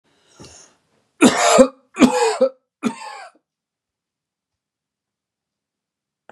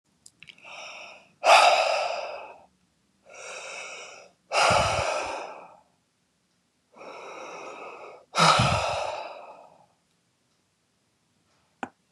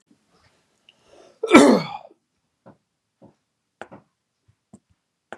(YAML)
three_cough_length: 6.3 s
three_cough_amplitude: 32768
three_cough_signal_mean_std_ratio: 0.3
exhalation_length: 12.1 s
exhalation_amplitude: 22958
exhalation_signal_mean_std_ratio: 0.4
cough_length: 5.4 s
cough_amplitude: 32768
cough_signal_mean_std_ratio: 0.2
survey_phase: beta (2021-08-13 to 2022-03-07)
age: 18-44
gender: Male
wearing_mask: 'No'
symptom_none: true
smoker_status: Never smoked
respiratory_condition_asthma: false
respiratory_condition_other: false
recruitment_source: REACT
submission_delay: 2 days
covid_test_result: Negative
covid_test_method: RT-qPCR